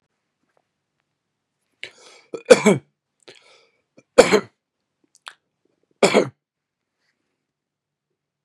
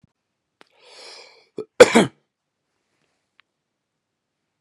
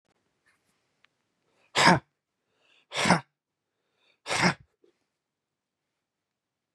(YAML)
three_cough_length: 8.4 s
three_cough_amplitude: 32768
three_cough_signal_mean_std_ratio: 0.19
cough_length: 4.6 s
cough_amplitude: 32768
cough_signal_mean_std_ratio: 0.16
exhalation_length: 6.7 s
exhalation_amplitude: 21267
exhalation_signal_mean_std_ratio: 0.24
survey_phase: beta (2021-08-13 to 2022-03-07)
age: 45-64
gender: Male
wearing_mask: 'No'
symptom_none: true
smoker_status: Never smoked
respiratory_condition_asthma: true
respiratory_condition_other: false
recruitment_source: REACT
submission_delay: 2 days
covid_test_result: Negative
covid_test_method: RT-qPCR
influenza_a_test_result: Negative
influenza_b_test_result: Negative